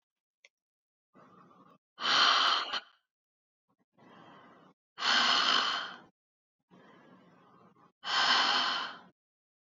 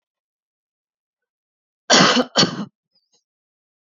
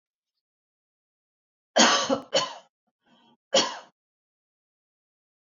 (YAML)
exhalation_length: 9.7 s
exhalation_amplitude: 8251
exhalation_signal_mean_std_ratio: 0.43
cough_length: 3.9 s
cough_amplitude: 32768
cough_signal_mean_std_ratio: 0.29
three_cough_length: 5.5 s
three_cough_amplitude: 20560
three_cough_signal_mean_std_ratio: 0.28
survey_phase: beta (2021-08-13 to 2022-03-07)
age: 45-64
gender: Female
wearing_mask: 'No'
symptom_fatigue: true
smoker_status: Never smoked
respiratory_condition_asthma: false
respiratory_condition_other: false
recruitment_source: REACT
submission_delay: 3 days
covid_test_result: Negative
covid_test_method: RT-qPCR
influenza_a_test_result: Negative
influenza_b_test_result: Negative